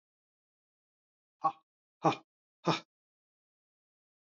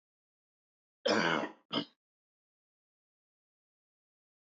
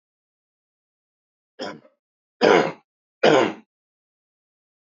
{"exhalation_length": "4.3 s", "exhalation_amplitude": 8094, "exhalation_signal_mean_std_ratio": 0.19, "cough_length": "4.5 s", "cough_amplitude": 4839, "cough_signal_mean_std_ratio": 0.26, "three_cough_length": "4.9 s", "three_cough_amplitude": 25297, "three_cough_signal_mean_std_ratio": 0.27, "survey_phase": "beta (2021-08-13 to 2022-03-07)", "age": "18-44", "gender": "Male", "wearing_mask": "No", "symptom_cough_any": true, "symptom_runny_or_blocked_nose": true, "symptom_shortness_of_breath": true, "symptom_fatigue": true, "symptom_onset": "5 days", "smoker_status": "Never smoked", "respiratory_condition_asthma": false, "respiratory_condition_other": false, "recruitment_source": "REACT", "submission_delay": "1 day", "covid_test_result": "Positive", "covid_test_method": "RT-qPCR", "covid_ct_value": 20.0, "covid_ct_gene": "E gene", "influenza_a_test_result": "Negative", "influenza_b_test_result": "Negative"}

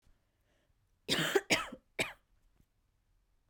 {"three_cough_length": "3.5 s", "three_cough_amplitude": 6514, "three_cough_signal_mean_std_ratio": 0.31, "survey_phase": "beta (2021-08-13 to 2022-03-07)", "age": "18-44", "gender": "Female", "wearing_mask": "No", "symptom_cough_any": true, "symptom_sore_throat": true, "symptom_headache": true, "smoker_status": "Never smoked", "respiratory_condition_asthma": false, "respiratory_condition_other": false, "recruitment_source": "Test and Trace", "submission_delay": "2 days", "covid_test_result": "Positive", "covid_test_method": "RT-qPCR", "covid_ct_value": 28.2, "covid_ct_gene": "N gene", "covid_ct_mean": 28.2, "covid_viral_load": "560 copies/ml", "covid_viral_load_category": "Minimal viral load (< 10K copies/ml)"}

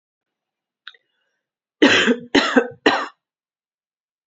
{"three_cough_length": "4.3 s", "three_cough_amplitude": 32046, "three_cough_signal_mean_std_ratio": 0.34, "survey_phase": "beta (2021-08-13 to 2022-03-07)", "age": "18-44", "gender": "Female", "wearing_mask": "No", "symptom_cough_any": true, "symptom_runny_or_blocked_nose": true, "symptom_fever_high_temperature": true, "symptom_headache": true, "smoker_status": "Ex-smoker", "respiratory_condition_asthma": false, "respiratory_condition_other": false, "recruitment_source": "Test and Trace", "submission_delay": "2 days", "covid_test_result": "Positive", "covid_test_method": "RT-qPCR", "covid_ct_value": 19.7, "covid_ct_gene": "ORF1ab gene"}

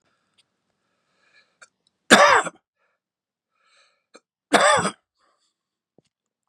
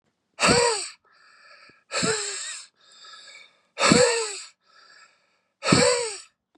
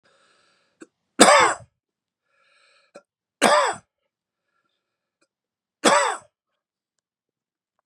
{"cough_length": "6.5 s", "cough_amplitude": 32767, "cough_signal_mean_std_ratio": 0.25, "exhalation_length": "6.6 s", "exhalation_amplitude": 24314, "exhalation_signal_mean_std_ratio": 0.44, "three_cough_length": "7.9 s", "three_cough_amplitude": 32768, "three_cough_signal_mean_std_ratio": 0.26, "survey_phase": "beta (2021-08-13 to 2022-03-07)", "age": "65+", "gender": "Male", "wearing_mask": "No", "symptom_cough_any": true, "symptom_runny_or_blocked_nose": true, "symptom_onset": "12 days", "smoker_status": "Never smoked", "respiratory_condition_asthma": false, "respiratory_condition_other": false, "recruitment_source": "REACT", "submission_delay": "2 days", "covid_test_result": "Negative", "covid_test_method": "RT-qPCR", "influenza_a_test_result": "Negative", "influenza_b_test_result": "Negative"}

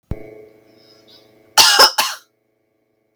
{"cough_length": "3.2 s", "cough_amplitude": 32768, "cough_signal_mean_std_ratio": 0.32, "survey_phase": "beta (2021-08-13 to 2022-03-07)", "age": "45-64", "gender": "Female", "wearing_mask": "No", "symptom_none": true, "smoker_status": "Never smoked", "respiratory_condition_asthma": false, "respiratory_condition_other": false, "recruitment_source": "REACT", "submission_delay": "3 days", "covid_test_result": "Negative", "covid_test_method": "RT-qPCR"}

